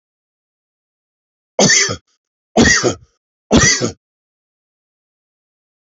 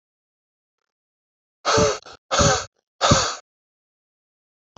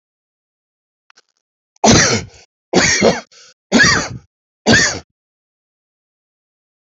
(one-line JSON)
{"three_cough_length": "5.9 s", "three_cough_amplitude": 30517, "three_cough_signal_mean_std_ratio": 0.34, "exhalation_length": "4.8 s", "exhalation_amplitude": 23660, "exhalation_signal_mean_std_ratio": 0.36, "cough_length": "6.8 s", "cough_amplitude": 32768, "cough_signal_mean_std_ratio": 0.38, "survey_phase": "beta (2021-08-13 to 2022-03-07)", "age": "45-64", "gender": "Male", "wearing_mask": "No", "symptom_cough_any": true, "symptom_runny_or_blocked_nose": true, "symptom_shortness_of_breath": true, "symptom_sore_throat": true, "symptom_fatigue": true, "symptom_fever_high_temperature": true, "symptom_headache": true, "symptom_onset": "4 days", "smoker_status": "Current smoker (e-cigarettes or vapes only)", "respiratory_condition_asthma": true, "respiratory_condition_other": false, "recruitment_source": "Test and Trace", "submission_delay": "1 day", "covid_test_result": "Positive", "covid_test_method": "ePCR"}